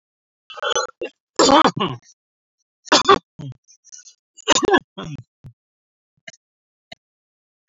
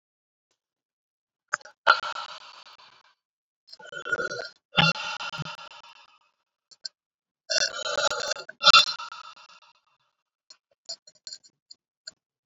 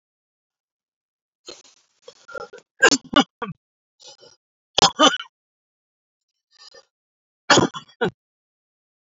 cough_length: 7.7 s
cough_amplitude: 28477
cough_signal_mean_std_ratio: 0.3
exhalation_length: 12.5 s
exhalation_amplitude: 26400
exhalation_signal_mean_std_ratio: 0.28
three_cough_length: 9.0 s
three_cough_amplitude: 28133
three_cough_signal_mean_std_ratio: 0.23
survey_phase: beta (2021-08-13 to 2022-03-07)
age: 65+
gender: Male
wearing_mask: 'No'
symptom_cough_any: true
smoker_status: Ex-smoker
respiratory_condition_asthma: false
respiratory_condition_other: false
recruitment_source: Test and Trace
submission_delay: 2 days
covid_test_result: Positive
covid_test_method: RT-qPCR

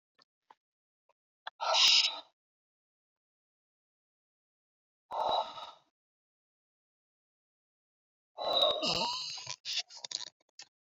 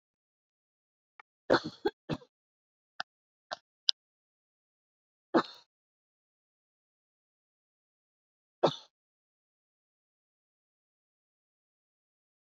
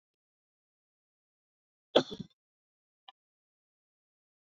exhalation_length: 10.9 s
exhalation_amplitude: 7690
exhalation_signal_mean_std_ratio: 0.33
three_cough_length: 12.5 s
three_cough_amplitude: 26485
three_cough_signal_mean_std_ratio: 0.13
cough_length: 4.5 s
cough_amplitude: 11007
cough_signal_mean_std_ratio: 0.11
survey_phase: beta (2021-08-13 to 2022-03-07)
age: 45-64
gender: Female
wearing_mask: 'No'
symptom_runny_or_blocked_nose: true
smoker_status: Ex-smoker
respiratory_condition_asthma: false
respiratory_condition_other: false
recruitment_source: Test and Trace
submission_delay: 0 days
covid_test_result: Negative
covid_test_method: LFT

